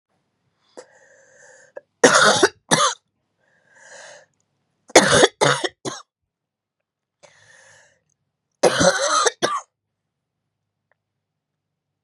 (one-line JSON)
{"three_cough_length": "12.0 s", "three_cough_amplitude": 32768, "three_cough_signal_mean_std_ratio": 0.31, "survey_phase": "beta (2021-08-13 to 2022-03-07)", "age": "45-64", "gender": "Female", "wearing_mask": "No", "symptom_cough_any": true, "symptom_fatigue": true, "symptom_headache": true, "smoker_status": "Never smoked", "respiratory_condition_asthma": false, "respiratory_condition_other": false, "recruitment_source": "Test and Trace", "submission_delay": "2 days", "covid_test_result": "Positive", "covid_test_method": "LFT"}